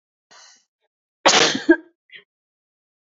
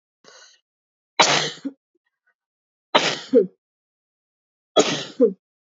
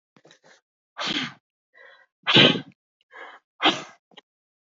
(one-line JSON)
{"cough_length": "3.1 s", "cough_amplitude": 27398, "cough_signal_mean_std_ratio": 0.28, "three_cough_length": "5.7 s", "three_cough_amplitude": 28451, "three_cough_signal_mean_std_ratio": 0.32, "exhalation_length": "4.7 s", "exhalation_amplitude": 27302, "exhalation_signal_mean_std_ratio": 0.28, "survey_phase": "beta (2021-08-13 to 2022-03-07)", "age": "45-64", "gender": "Female", "wearing_mask": "No", "symptom_none": true, "smoker_status": "Never smoked", "respiratory_condition_asthma": false, "respiratory_condition_other": false, "recruitment_source": "REACT", "submission_delay": "2 days", "covid_test_result": "Negative", "covid_test_method": "RT-qPCR", "influenza_a_test_result": "Negative", "influenza_b_test_result": "Negative"}